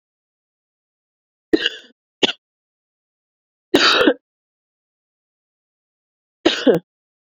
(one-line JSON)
{"three_cough_length": "7.3 s", "three_cough_amplitude": 32767, "three_cough_signal_mean_std_ratio": 0.26, "survey_phase": "beta (2021-08-13 to 2022-03-07)", "age": "18-44", "gender": "Female", "wearing_mask": "No", "symptom_cough_any": true, "symptom_runny_or_blocked_nose": true, "symptom_fatigue": true, "symptom_fever_high_temperature": true, "symptom_headache": true, "symptom_change_to_sense_of_smell_or_taste": true, "symptom_loss_of_taste": true, "symptom_onset": "3 days", "smoker_status": "Ex-smoker", "respiratory_condition_asthma": false, "respiratory_condition_other": false, "recruitment_source": "Test and Trace", "submission_delay": "2 days", "covid_test_result": "Positive", "covid_test_method": "RT-qPCR"}